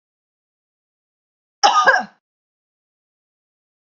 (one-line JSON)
{"cough_length": "3.9 s", "cough_amplitude": 32768, "cough_signal_mean_std_ratio": 0.25, "survey_phase": "beta (2021-08-13 to 2022-03-07)", "age": "45-64", "gender": "Female", "wearing_mask": "No", "symptom_none": true, "smoker_status": "Never smoked", "respiratory_condition_asthma": false, "respiratory_condition_other": false, "recruitment_source": "REACT", "submission_delay": "1 day", "covid_test_result": "Negative", "covid_test_method": "RT-qPCR", "influenza_a_test_result": "Negative", "influenza_b_test_result": "Negative"}